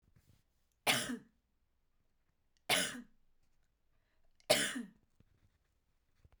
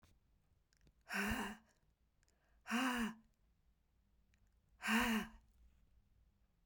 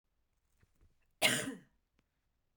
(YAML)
three_cough_length: 6.4 s
three_cough_amplitude: 6108
three_cough_signal_mean_std_ratio: 0.28
exhalation_length: 6.7 s
exhalation_amplitude: 2159
exhalation_signal_mean_std_ratio: 0.39
cough_length: 2.6 s
cough_amplitude: 6192
cough_signal_mean_std_ratio: 0.26
survey_phase: beta (2021-08-13 to 2022-03-07)
age: 18-44
gender: Female
wearing_mask: 'No'
symptom_runny_or_blocked_nose: true
symptom_onset: 12 days
smoker_status: Ex-smoker
respiratory_condition_asthma: false
respiratory_condition_other: false
recruitment_source: REACT
submission_delay: 1 day
covid_test_result: Negative
covid_test_method: RT-qPCR
influenza_a_test_result: Negative
influenza_b_test_result: Negative